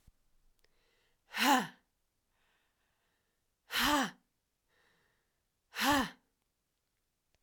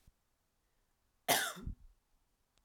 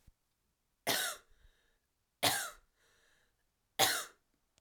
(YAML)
exhalation_length: 7.4 s
exhalation_amplitude: 6169
exhalation_signal_mean_std_ratio: 0.29
cough_length: 2.6 s
cough_amplitude: 6796
cough_signal_mean_std_ratio: 0.28
three_cough_length: 4.6 s
three_cough_amplitude: 6710
three_cough_signal_mean_std_ratio: 0.32
survey_phase: alpha (2021-03-01 to 2021-08-12)
age: 18-44
gender: Female
wearing_mask: 'No'
symptom_diarrhoea: true
symptom_fatigue: true
symptom_fever_high_temperature: true
symptom_headache: true
smoker_status: Never smoked
respiratory_condition_asthma: false
respiratory_condition_other: false
recruitment_source: Test and Trace
submission_delay: 2 days
covid_test_result: Positive
covid_test_method: RT-qPCR
covid_ct_value: 22.5
covid_ct_gene: ORF1ab gene
covid_ct_mean: 23.0
covid_viral_load: 28000 copies/ml
covid_viral_load_category: Low viral load (10K-1M copies/ml)